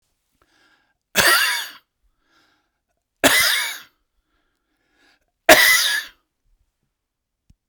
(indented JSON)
{
  "three_cough_length": "7.7 s",
  "three_cough_amplitude": 32768,
  "three_cough_signal_mean_std_ratio": 0.33,
  "survey_phase": "beta (2021-08-13 to 2022-03-07)",
  "age": "45-64",
  "gender": "Male",
  "wearing_mask": "No",
  "symptom_none": true,
  "smoker_status": "Never smoked",
  "respiratory_condition_asthma": false,
  "respiratory_condition_other": true,
  "recruitment_source": "REACT",
  "submission_delay": "2 days",
  "covid_test_result": "Negative",
  "covid_test_method": "RT-qPCR"
}